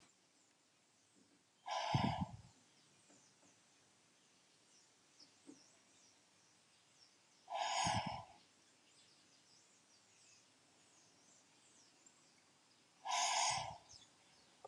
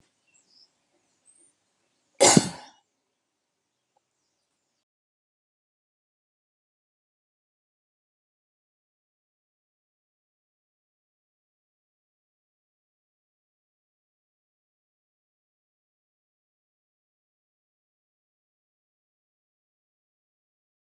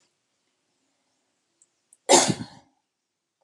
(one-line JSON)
{"exhalation_length": "14.7 s", "exhalation_amplitude": 2508, "exhalation_signal_mean_std_ratio": 0.35, "cough_length": "20.9 s", "cough_amplitude": 29529, "cough_signal_mean_std_ratio": 0.08, "three_cough_length": "3.4 s", "three_cough_amplitude": 27492, "three_cough_signal_mean_std_ratio": 0.21, "survey_phase": "beta (2021-08-13 to 2022-03-07)", "age": "65+", "gender": "Female", "wearing_mask": "No", "symptom_none": true, "smoker_status": "Ex-smoker", "respiratory_condition_asthma": false, "respiratory_condition_other": false, "recruitment_source": "REACT", "submission_delay": "2 days", "covid_test_result": "Negative", "covid_test_method": "RT-qPCR"}